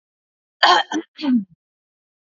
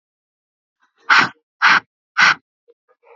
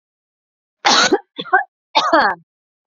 cough_length: 2.2 s
cough_amplitude: 28220
cough_signal_mean_std_ratio: 0.38
exhalation_length: 3.2 s
exhalation_amplitude: 29545
exhalation_signal_mean_std_ratio: 0.33
three_cough_length: 2.9 s
three_cough_amplitude: 30399
three_cough_signal_mean_std_ratio: 0.43
survey_phase: beta (2021-08-13 to 2022-03-07)
age: 18-44
gender: Female
wearing_mask: 'No'
symptom_runny_or_blocked_nose: true
symptom_sore_throat: true
symptom_onset: 11 days
smoker_status: Never smoked
respiratory_condition_asthma: false
respiratory_condition_other: false
recruitment_source: REACT
submission_delay: 1 day
covid_test_result: Negative
covid_test_method: RT-qPCR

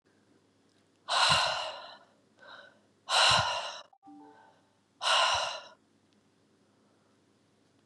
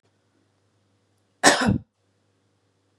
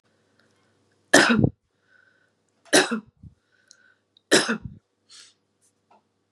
exhalation_length: 7.9 s
exhalation_amplitude: 8452
exhalation_signal_mean_std_ratio: 0.4
cough_length: 3.0 s
cough_amplitude: 32347
cough_signal_mean_std_ratio: 0.25
three_cough_length: 6.3 s
three_cough_amplitude: 31280
three_cough_signal_mean_std_ratio: 0.27
survey_phase: beta (2021-08-13 to 2022-03-07)
age: 45-64
gender: Female
wearing_mask: 'No'
symptom_runny_or_blocked_nose: true
symptom_fatigue: true
symptom_headache: true
smoker_status: Never smoked
respiratory_condition_asthma: false
respiratory_condition_other: false
recruitment_source: REACT
submission_delay: 1 day
covid_test_result: Negative
covid_test_method: RT-qPCR
influenza_a_test_result: Negative
influenza_b_test_result: Negative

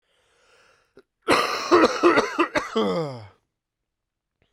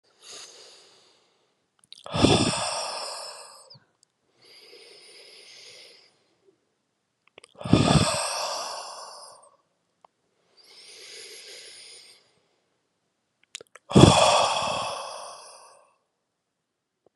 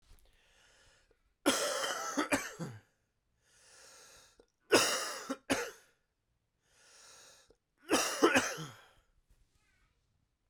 cough_length: 4.5 s
cough_amplitude: 20672
cough_signal_mean_std_ratio: 0.46
exhalation_length: 17.2 s
exhalation_amplitude: 32768
exhalation_signal_mean_std_ratio: 0.31
three_cough_length: 10.5 s
three_cough_amplitude: 9087
three_cough_signal_mean_std_ratio: 0.36
survey_phase: beta (2021-08-13 to 2022-03-07)
age: 18-44
gender: Male
wearing_mask: 'No'
symptom_cough_any: true
symptom_new_continuous_cough: true
symptom_runny_or_blocked_nose: true
symptom_shortness_of_breath: true
symptom_diarrhoea: true
symptom_fatigue: true
symptom_fever_high_temperature: true
symptom_headache: true
symptom_change_to_sense_of_smell_or_taste: true
symptom_onset: 4 days
smoker_status: Ex-smoker
respiratory_condition_asthma: true
respiratory_condition_other: false
recruitment_source: Test and Trace
submission_delay: 1 day
covid_test_result: Positive
covid_ct_value: 17.5
covid_ct_gene: S gene
covid_ct_mean: 17.8
covid_viral_load: 1500000 copies/ml
covid_viral_load_category: High viral load (>1M copies/ml)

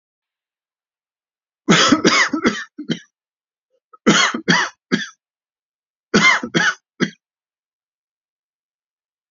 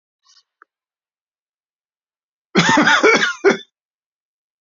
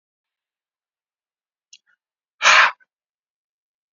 three_cough_length: 9.3 s
three_cough_amplitude: 31246
three_cough_signal_mean_std_ratio: 0.37
cough_length: 4.6 s
cough_amplitude: 31206
cough_signal_mean_std_ratio: 0.35
exhalation_length: 3.9 s
exhalation_amplitude: 28962
exhalation_signal_mean_std_ratio: 0.21
survey_phase: alpha (2021-03-01 to 2021-08-12)
age: 45-64
gender: Male
wearing_mask: 'No'
symptom_cough_any: true
symptom_fatigue: true
symptom_onset: 2 days
smoker_status: Never smoked
respiratory_condition_asthma: false
respiratory_condition_other: false
recruitment_source: Test and Trace
submission_delay: 1 day
covid_test_result: Positive
covid_test_method: RT-qPCR
covid_ct_value: 11.9
covid_ct_gene: ORF1ab gene
covid_ct_mean: 12.2
covid_viral_load: 100000000 copies/ml
covid_viral_load_category: High viral load (>1M copies/ml)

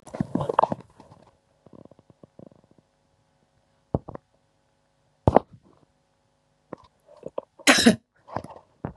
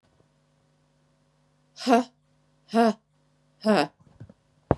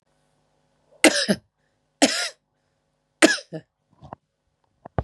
cough_length: 9.0 s
cough_amplitude: 32768
cough_signal_mean_std_ratio: 0.21
exhalation_length: 4.8 s
exhalation_amplitude: 26322
exhalation_signal_mean_std_ratio: 0.28
three_cough_length: 5.0 s
three_cough_amplitude: 32767
three_cough_signal_mean_std_ratio: 0.26
survey_phase: beta (2021-08-13 to 2022-03-07)
age: 45-64
gender: Female
wearing_mask: 'No'
symptom_none: true
smoker_status: Never smoked
respiratory_condition_asthma: false
respiratory_condition_other: false
recruitment_source: REACT
submission_delay: 3 days
covid_test_result: Negative
covid_test_method: RT-qPCR
influenza_a_test_result: Negative
influenza_b_test_result: Negative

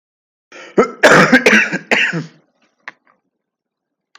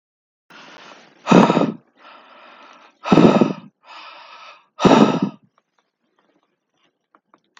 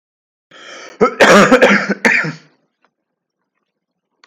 three_cough_length: 4.2 s
three_cough_amplitude: 32768
three_cough_signal_mean_std_ratio: 0.41
exhalation_length: 7.6 s
exhalation_amplitude: 32768
exhalation_signal_mean_std_ratio: 0.33
cough_length: 4.3 s
cough_amplitude: 32768
cough_signal_mean_std_ratio: 0.41
survey_phase: beta (2021-08-13 to 2022-03-07)
age: 18-44
gender: Male
wearing_mask: 'No'
symptom_cough_any: true
symptom_onset: 12 days
smoker_status: Never smoked
respiratory_condition_asthma: false
respiratory_condition_other: false
recruitment_source: REACT
submission_delay: 1 day
covid_test_result: Negative
covid_test_method: RT-qPCR
influenza_a_test_result: Negative
influenza_b_test_result: Negative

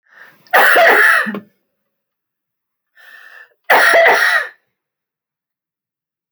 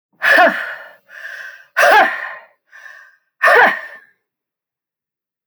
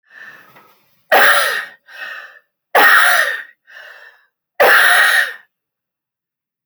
cough_length: 6.3 s
cough_amplitude: 31656
cough_signal_mean_std_ratio: 0.43
exhalation_length: 5.5 s
exhalation_amplitude: 28885
exhalation_signal_mean_std_ratio: 0.41
three_cough_length: 6.7 s
three_cough_amplitude: 32768
three_cough_signal_mean_std_ratio: 0.46
survey_phase: alpha (2021-03-01 to 2021-08-12)
age: 45-64
gender: Female
wearing_mask: 'No'
symptom_fatigue: true
symptom_onset: 12 days
smoker_status: Never smoked
respiratory_condition_asthma: false
respiratory_condition_other: false
recruitment_source: REACT
submission_delay: 1 day
covid_test_result: Negative
covid_test_method: RT-qPCR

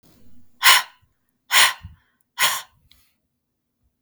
exhalation_length: 4.0 s
exhalation_amplitude: 32768
exhalation_signal_mean_std_ratio: 0.3
survey_phase: beta (2021-08-13 to 2022-03-07)
age: 18-44
gender: Female
wearing_mask: 'No'
symptom_cough_any: true
smoker_status: Never smoked
respiratory_condition_asthma: false
respiratory_condition_other: false
recruitment_source: REACT
submission_delay: 2 days
covid_test_result: Negative
covid_test_method: RT-qPCR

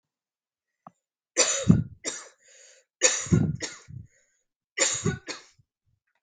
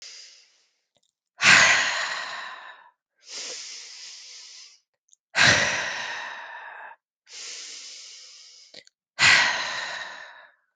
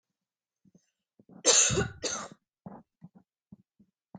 three_cough_length: 6.2 s
three_cough_amplitude: 20734
three_cough_signal_mean_std_ratio: 0.36
exhalation_length: 10.8 s
exhalation_amplitude: 30203
exhalation_signal_mean_std_ratio: 0.4
cough_length: 4.2 s
cough_amplitude: 11874
cough_signal_mean_std_ratio: 0.3
survey_phase: beta (2021-08-13 to 2022-03-07)
age: 18-44
gender: Female
wearing_mask: 'No'
symptom_cough_any: true
symptom_runny_or_blocked_nose: true
symptom_headache: true
symptom_change_to_sense_of_smell_or_taste: true
symptom_loss_of_taste: true
symptom_onset: 3 days
smoker_status: Never smoked
respiratory_condition_asthma: false
respiratory_condition_other: false
recruitment_source: Test and Trace
submission_delay: 1 day
covid_test_result: Positive
covid_test_method: RT-qPCR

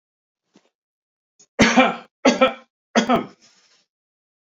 three_cough_length: 4.5 s
three_cough_amplitude: 29573
three_cough_signal_mean_std_ratio: 0.33
survey_phase: beta (2021-08-13 to 2022-03-07)
age: 45-64
gender: Male
wearing_mask: 'No'
symptom_none: true
smoker_status: Never smoked
respiratory_condition_asthma: false
respiratory_condition_other: false
recruitment_source: REACT
submission_delay: 2 days
covid_test_result: Negative
covid_test_method: RT-qPCR
influenza_a_test_result: Negative
influenza_b_test_result: Negative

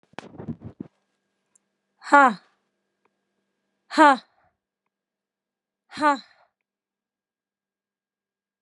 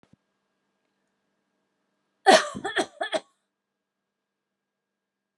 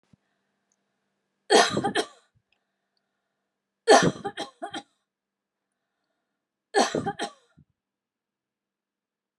exhalation_length: 8.6 s
exhalation_amplitude: 30595
exhalation_signal_mean_std_ratio: 0.19
cough_length: 5.4 s
cough_amplitude: 23302
cough_signal_mean_std_ratio: 0.2
three_cough_length: 9.4 s
three_cough_amplitude: 24660
three_cough_signal_mean_std_ratio: 0.25
survey_phase: alpha (2021-03-01 to 2021-08-12)
age: 45-64
gender: Female
wearing_mask: 'No'
symptom_none: true
smoker_status: Never smoked
respiratory_condition_asthma: false
respiratory_condition_other: false
recruitment_source: REACT
submission_delay: 1 day
covid_test_result: Negative
covid_test_method: RT-qPCR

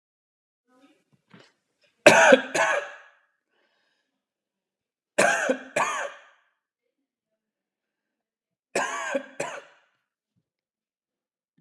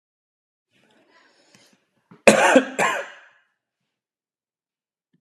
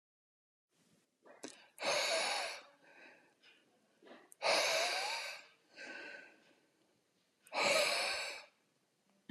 three_cough_length: 11.6 s
three_cough_amplitude: 31691
three_cough_signal_mean_std_ratio: 0.27
cough_length: 5.2 s
cough_amplitude: 32768
cough_signal_mean_std_ratio: 0.25
exhalation_length: 9.3 s
exhalation_amplitude: 3306
exhalation_signal_mean_std_ratio: 0.46
survey_phase: alpha (2021-03-01 to 2021-08-12)
age: 18-44
gender: Male
wearing_mask: 'No'
symptom_none: true
smoker_status: Never smoked
respiratory_condition_asthma: true
respiratory_condition_other: false
recruitment_source: REACT
submission_delay: 2 days
covid_test_result: Negative
covid_test_method: RT-qPCR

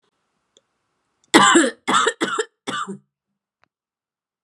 cough_length: 4.4 s
cough_amplitude: 32768
cough_signal_mean_std_ratio: 0.35
survey_phase: beta (2021-08-13 to 2022-03-07)
age: 18-44
gender: Female
wearing_mask: 'No'
symptom_headache: true
smoker_status: Never smoked
respiratory_condition_asthma: false
respiratory_condition_other: false
recruitment_source: Test and Trace
submission_delay: 1 day
covid_test_result: Positive
covid_test_method: RT-qPCR
covid_ct_value: 32.5
covid_ct_gene: ORF1ab gene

